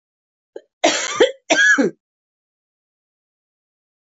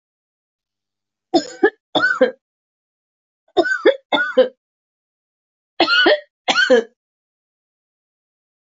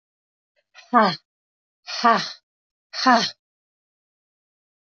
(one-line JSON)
{"cough_length": "4.0 s", "cough_amplitude": 24613, "cough_signal_mean_std_ratio": 0.35, "three_cough_length": "8.6 s", "three_cough_amplitude": 25162, "three_cough_signal_mean_std_ratio": 0.36, "exhalation_length": "4.9 s", "exhalation_amplitude": 24293, "exhalation_signal_mean_std_ratio": 0.3, "survey_phase": "alpha (2021-03-01 to 2021-08-12)", "age": "45-64", "gender": "Female", "wearing_mask": "No", "symptom_diarrhoea": true, "symptom_fatigue": true, "symptom_headache": true, "smoker_status": "Never smoked", "respiratory_condition_asthma": false, "respiratory_condition_other": false, "recruitment_source": "Test and Trace", "submission_delay": "2 days", "covid_test_result": "Positive", "covid_test_method": "RT-qPCR", "covid_ct_value": 22.5, "covid_ct_gene": "ORF1ab gene"}